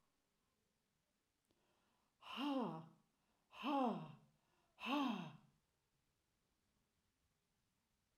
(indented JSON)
{
  "exhalation_length": "8.2 s",
  "exhalation_amplitude": 1081,
  "exhalation_signal_mean_std_ratio": 0.35,
  "survey_phase": "alpha (2021-03-01 to 2021-08-12)",
  "age": "65+",
  "gender": "Female",
  "wearing_mask": "No",
  "symptom_none": true,
  "smoker_status": "Never smoked",
  "respiratory_condition_asthma": false,
  "respiratory_condition_other": false,
  "recruitment_source": "REACT",
  "submission_delay": "1 day",
  "covid_test_result": "Negative",
  "covid_test_method": "RT-qPCR"
}